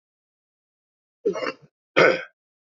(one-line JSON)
{"cough_length": "2.6 s", "cough_amplitude": 25446, "cough_signal_mean_std_ratio": 0.29, "survey_phase": "beta (2021-08-13 to 2022-03-07)", "age": "45-64", "gender": "Male", "wearing_mask": "Yes", "symptom_cough_any": true, "symptom_runny_or_blocked_nose": true, "symptom_onset": "5 days", "smoker_status": "Current smoker (11 or more cigarettes per day)", "respiratory_condition_asthma": false, "respiratory_condition_other": false, "recruitment_source": "Test and Trace", "submission_delay": "4 days", "covid_test_result": "Positive", "covid_test_method": "LAMP"}